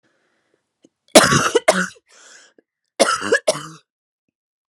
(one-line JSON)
{"cough_length": "4.7 s", "cough_amplitude": 32768, "cough_signal_mean_std_ratio": 0.33, "survey_phase": "alpha (2021-03-01 to 2021-08-12)", "age": "45-64", "gender": "Female", "wearing_mask": "No", "symptom_cough_any": true, "symptom_shortness_of_breath": true, "symptom_fatigue": true, "symptom_change_to_sense_of_smell_or_taste": true, "symptom_loss_of_taste": true, "symptom_onset": "3 days", "smoker_status": "Ex-smoker", "respiratory_condition_asthma": false, "respiratory_condition_other": false, "recruitment_source": "Test and Trace", "submission_delay": "2 days", "covid_test_result": "Positive", "covid_test_method": "RT-qPCR", "covid_ct_value": 14.8, "covid_ct_gene": "ORF1ab gene", "covid_ct_mean": 15.1, "covid_viral_load": "11000000 copies/ml", "covid_viral_load_category": "High viral load (>1M copies/ml)"}